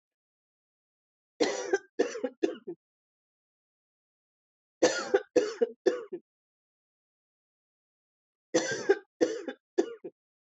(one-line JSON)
{"three_cough_length": "10.5 s", "three_cough_amplitude": 9236, "three_cough_signal_mean_std_ratio": 0.32, "survey_phase": "beta (2021-08-13 to 2022-03-07)", "age": "45-64", "gender": "Female", "wearing_mask": "No", "symptom_none": true, "smoker_status": "Never smoked", "respiratory_condition_asthma": false, "respiratory_condition_other": false, "recruitment_source": "REACT", "submission_delay": "2 days", "covid_test_result": "Negative", "covid_test_method": "RT-qPCR"}